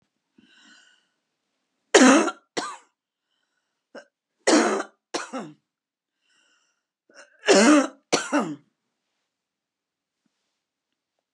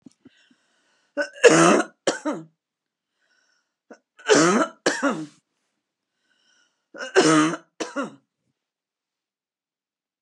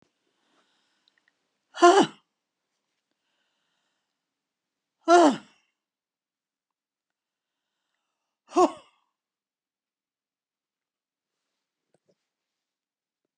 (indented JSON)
{
  "cough_length": "11.3 s",
  "cough_amplitude": 28204,
  "cough_signal_mean_std_ratio": 0.29,
  "three_cough_length": "10.2 s",
  "three_cough_amplitude": 32713,
  "three_cough_signal_mean_std_ratio": 0.33,
  "exhalation_length": "13.4 s",
  "exhalation_amplitude": 23866,
  "exhalation_signal_mean_std_ratio": 0.17,
  "survey_phase": "beta (2021-08-13 to 2022-03-07)",
  "age": "65+",
  "gender": "Female",
  "wearing_mask": "No",
  "symptom_none": true,
  "smoker_status": "Never smoked",
  "respiratory_condition_asthma": false,
  "respiratory_condition_other": true,
  "recruitment_source": "REACT",
  "submission_delay": "1 day",
  "covid_test_result": "Negative",
  "covid_test_method": "RT-qPCR",
  "influenza_a_test_result": "Negative",
  "influenza_b_test_result": "Negative"
}